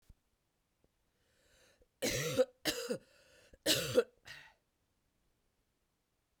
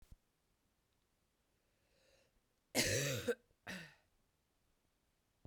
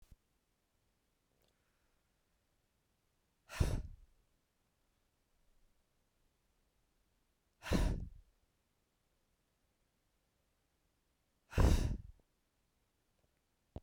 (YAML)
three_cough_length: 6.4 s
three_cough_amplitude: 4884
three_cough_signal_mean_std_ratio: 0.31
cough_length: 5.5 s
cough_amplitude: 3470
cough_signal_mean_std_ratio: 0.29
exhalation_length: 13.8 s
exhalation_amplitude: 4470
exhalation_signal_mean_std_ratio: 0.22
survey_phase: beta (2021-08-13 to 2022-03-07)
age: 18-44
gender: Female
wearing_mask: 'No'
symptom_cough_any: true
symptom_runny_or_blocked_nose: true
symptom_sore_throat: true
symptom_fatigue: true
symptom_onset: 7 days
smoker_status: Never smoked
respiratory_condition_asthma: true
respiratory_condition_other: false
recruitment_source: Test and Trace
submission_delay: 2 days
covid_test_result: Positive
covid_test_method: ePCR